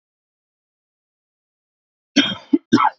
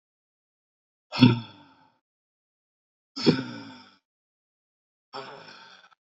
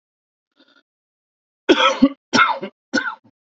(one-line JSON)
{"cough_length": "3.0 s", "cough_amplitude": 27024, "cough_signal_mean_std_ratio": 0.27, "exhalation_length": "6.1 s", "exhalation_amplitude": 24375, "exhalation_signal_mean_std_ratio": 0.21, "three_cough_length": "3.4 s", "three_cough_amplitude": 28142, "three_cough_signal_mean_std_ratio": 0.36, "survey_phase": "beta (2021-08-13 to 2022-03-07)", "age": "45-64", "gender": "Male", "wearing_mask": "No", "symptom_cough_any": true, "symptom_runny_or_blocked_nose": true, "symptom_fatigue": true, "symptom_onset": "13 days", "smoker_status": "Never smoked", "respiratory_condition_asthma": false, "respiratory_condition_other": false, "recruitment_source": "REACT", "submission_delay": "1 day", "covid_test_result": "Negative", "covid_test_method": "RT-qPCR", "influenza_a_test_result": "Negative", "influenza_b_test_result": "Negative"}